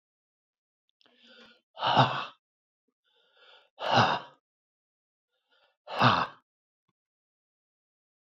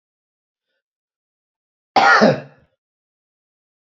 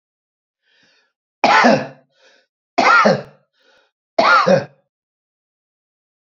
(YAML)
exhalation_length: 8.4 s
exhalation_amplitude: 14589
exhalation_signal_mean_std_ratio: 0.28
cough_length: 3.8 s
cough_amplitude: 28282
cough_signal_mean_std_ratio: 0.27
three_cough_length: 6.4 s
three_cough_amplitude: 32767
three_cough_signal_mean_std_ratio: 0.37
survey_phase: beta (2021-08-13 to 2022-03-07)
age: 65+
gender: Male
wearing_mask: 'No'
symptom_none: true
smoker_status: Never smoked
respiratory_condition_asthma: false
respiratory_condition_other: false
recruitment_source: REACT
submission_delay: 9 days
covid_test_result: Negative
covid_test_method: RT-qPCR
influenza_a_test_result: Negative
influenza_b_test_result: Negative